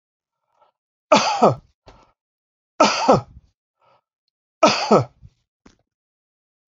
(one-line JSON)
{"three_cough_length": "6.7 s", "three_cough_amplitude": 28000, "three_cough_signal_mean_std_ratio": 0.31, "survey_phase": "beta (2021-08-13 to 2022-03-07)", "age": "45-64", "gender": "Male", "wearing_mask": "No", "symptom_none": true, "smoker_status": "Never smoked", "respiratory_condition_asthma": false, "respiratory_condition_other": false, "recruitment_source": "REACT", "submission_delay": "2 days", "covid_test_result": "Negative", "covid_test_method": "RT-qPCR"}